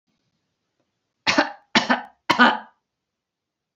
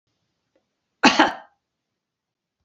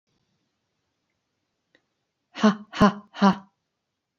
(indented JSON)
{
  "three_cough_length": "3.8 s",
  "three_cough_amplitude": 28071,
  "three_cough_signal_mean_std_ratio": 0.31,
  "cough_length": "2.6 s",
  "cough_amplitude": 32270,
  "cough_signal_mean_std_ratio": 0.23,
  "exhalation_length": "4.2 s",
  "exhalation_amplitude": 22058,
  "exhalation_signal_mean_std_ratio": 0.25,
  "survey_phase": "beta (2021-08-13 to 2022-03-07)",
  "age": "65+",
  "gender": "Female",
  "wearing_mask": "No",
  "symptom_none": true,
  "smoker_status": "Never smoked",
  "respiratory_condition_asthma": false,
  "respiratory_condition_other": false,
  "recruitment_source": "REACT",
  "submission_delay": "1 day",
  "covid_test_result": "Negative",
  "covid_test_method": "RT-qPCR",
  "influenza_a_test_result": "Negative",
  "influenza_b_test_result": "Negative"
}